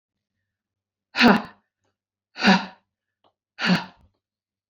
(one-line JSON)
{"exhalation_length": "4.7 s", "exhalation_amplitude": 23920, "exhalation_signal_mean_std_ratio": 0.29, "survey_phase": "beta (2021-08-13 to 2022-03-07)", "age": "45-64", "gender": "Female", "wearing_mask": "No", "symptom_none": true, "smoker_status": "Ex-smoker", "respiratory_condition_asthma": false, "respiratory_condition_other": false, "recruitment_source": "REACT", "submission_delay": "2 days", "covid_test_result": "Negative", "covid_test_method": "RT-qPCR"}